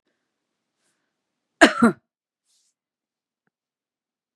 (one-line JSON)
{"cough_length": "4.4 s", "cough_amplitude": 32767, "cough_signal_mean_std_ratio": 0.17, "survey_phase": "beta (2021-08-13 to 2022-03-07)", "age": "45-64", "gender": "Female", "wearing_mask": "No", "symptom_cough_any": true, "symptom_runny_or_blocked_nose": true, "symptom_fatigue": true, "smoker_status": "Ex-smoker", "respiratory_condition_asthma": false, "respiratory_condition_other": false, "recruitment_source": "Test and Trace", "submission_delay": "2 days", "covid_test_result": "Positive", "covid_test_method": "RT-qPCR", "covid_ct_value": 21.0, "covid_ct_gene": "N gene"}